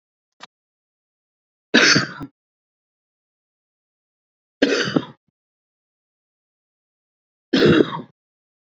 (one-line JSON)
{"three_cough_length": "8.7 s", "three_cough_amplitude": 31995, "three_cough_signal_mean_std_ratio": 0.27, "survey_phase": "beta (2021-08-13 to 2022-03-07)", "age": "18-44", "gender": "Male", "wearing_mask": "No", "symptom_fatigue": true, "symptom_headache": true, "symptom_onset": "12 days", "smoker_status": "Never smoked", "respiratory_condition_asthma": true, "respiratory_condition_other": false, "recruitment_source": "REACT", "submission_delay": "2 days", "covid_test_result": "Negative", "covid_test_method": "RT-qPCR", "influenza_a_test_result": "Negative", "influenza_b_test_result": "Negative"}